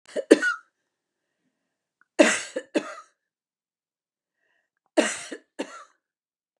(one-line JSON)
{"cough_length": "6.6 s", "cough_amplitude": 32274, "cough_signal_mean_std_ratio": 0.24, "survey_phase": "beta (2021-08-13 to 2022-03-07)", "age": "65+", "gender": "Female", "wearing_mask": "No", "symptom_none": true, "smoker_status": "Ex-smoker", "respiratory_condition_asthma": false, "respiratory_condition_other": false, "recruitment_source": "REACT", "submission_delay": "0 days", "covid_test_result": "Negative", "covid_test_method": "RT-qPCR", "influenza_a_test_result": "Negative", "influenza_b_test_result": "Negative"}